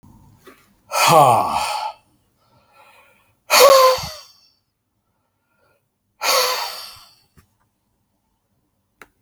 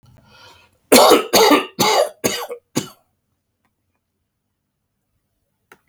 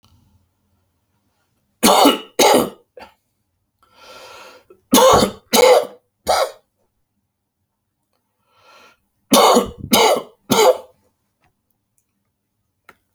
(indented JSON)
{
  "exhalation_length": "9.2 s",
  "exhalation_amplitude": 32768,
  "exhalation_signal_mean_std_ratio": 0.35,
  "cough_length": "5.9 s",
  "cough_amplitude": 32768,
  "cough_signal_mean_std_ratio": 0.35,
  "three_cough_length": "13.1 s",
  "three_cough_amplitude": 32768,
  "three_cough_signal_mean_std_ratio": 0.36,
  "survey_phase": "alpha (2021-03-01 to 2021-08-12)",
  "age": "65+",
  "gender": "Male",
  "wearing_mask": "No",
  "symptom_none": true,
  "smoker_status": "Never smoked",
  "respiratory_condition_asthma": false,
  "respiratory_condition_other": false,
  "recruitment_source": "REACT",
  "submission_delay": "2 days",
  "covid_test_result": "Negative",
  "covid_test_method": "RT-qPCR"
}